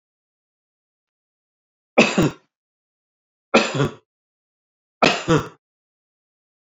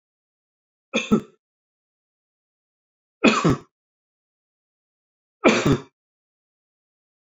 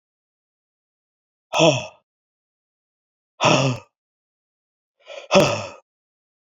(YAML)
three_cough_length: 6.7 s
three_cough_amplitude: 28556
three_cough_signal_mean_std_ratio: 0.27
cough_length: 7.3 s
cough_amplitude: 27504
cough_signal_mean_std_ratio: 0.25
exhalation_length: 6.5 s
exhalation_amplitude: 32768
exhalation_signal_mean_std_ratio: 0.29
survey_phase: beta (2021-08-13 to 2022-03-07)
age: 65+
gender: Male
wearing_mask: 'No'
symptom_cough_any: true
symptom_abdominal_pain: true
symptom_onset: 13 days
smoker_status: Ex-smoker
respiratory_condition_asthma: false
respiratory_condition_other: false
recruitment_source: REACT
submission_delay: 1 day
covid_test_result: Negative
covid_test_method: RT-qPCR